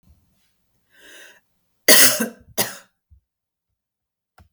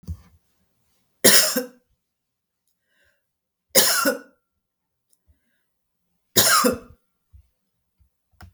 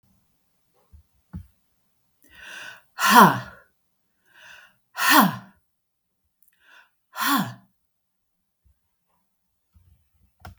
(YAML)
cough_length: 4.5 s
cough_amplitude: 32768
cough_signal_mean_std_ratio: 0.24
three_cough_length: 8.5 s
three_cough_amplitude: 32768
three_cough_signal_mean_std_ratio: 0.29
exhalation_length: 10.6 s
exhalation_amplitude: 32768
exhalation_signal_mean_std_ratio: 0.24
survey_phase: beta (2021-08-13 to 2022-03-07)
age: 45-64
gender: Female
wearing_mask: 'No'
symptom_sore_throat: true
symptom_onset: 12 days
smoker_status: Never smoked
respiratory_condition_asthma: false
respiratory_condition_other: true
recruitment_source: REACT
submission_delay: 1 day
covid_test_result: Negative
covid_test_method: RT-qPCR
influenza_a_test_result: Unknown/Void
influenza_b_test_result: Unknown/Void